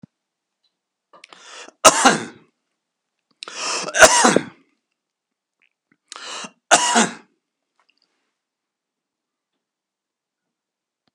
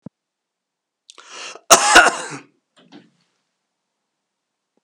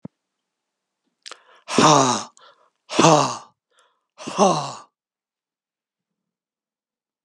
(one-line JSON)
{"three_cough_length": "11.1 s", "three_cough_amplitude": 32768, "three_cough_signal_mean_std_ratio": 0.25, "cough_length": "4.8 s", "cough_amplitude": 32768, "cough_signal_mean_std_ratio": 0.24, "exhalation_length": "7.2 s", "exhalation_amplitude": 32391, "exhalation_signal_mean_std_ratio": 0.31, "survey_phase": "beta (2021-08-13 to 2022-03-07)", "age": "65+", "gender": "Male", "wearing_mask": "No", "symptom_none": true, "smoker_status": "Ex-smoker", "respiratory_condition_asthma": false, "respiratory_condition_other": false, "recruitment_source": "REACT", "submission_delay": "1 day", "covid_test_result": "Negative", "covid_test_method": "RT-qPCR", "influenza_a_test_result": "Negative", "influenza_b_test_result": "Negative"}